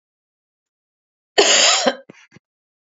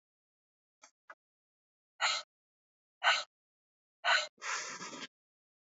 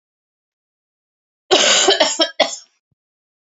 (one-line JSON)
{"cough_length": "2.9 s", "cough_amplitude": 28891, "cough_signal_mean_std_ratio": 0.35, "exhalation_length": "5.7 s", "exhalation_amplitude": 6406, "exhalation_signal_mean_std_ratio": 0.31, "three_cough_length": "3.4 s", "three_cough_amplitude": 30991, "three_cough_signal_mean_std_ratio": 0.39, "survey_phase": "alpha (2021-03-01 to 2021-08-12)", "age": "45-64", "gender": "Female", "wearing_mask": "No", "symptom_cough_any": true, "symptom_headache": true, "symptom_onset": "3 days", "smoker_status": "Ex-smoker", "respiratory_condition_asthma": false, "respiratory_condition_other": false, "recruitment_source": "Test and Trace", "submission_delay": "2 days", "covid_test_result": "Positive", "covid_test_method": "RT-qPCR", "covid_ct_value": 21.8, "covid_ct_gene": "ORF1ab gene"}